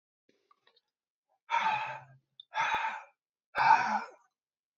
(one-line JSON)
{"exhalation_length": "4.8 s", "exhalation_amplitude": 9485, "exhalation_signal_mean_std_ratio": 0.4, "survey_phase": "beta (2021-08-13 to 2022-03-07)", "age": "18-44", "gender": "Male", "wearing_mask": "No", "symptom_cough_any": true, "symptom_runny_or_blocked_nose": true, "symptom_sore_throat": true, "symptom_abdominal_pain": true, "symptom_headache": true, "symptom_onset": "12 days", "smoker_status": "Never smoked", "respiratory_condition_asthma": false, "respiratory_condition_other": false, "recruitment_source": "REACT", "submission_delay": "1 day", "covid_test_result": "Positive", "covid_test_method": "RT-qPCR", "covid_ct_value": 25.0, "covid_ct_gene": "E gene", "influenza_a_test_result": "Negative", "influenza_b_test_result": "Negative"}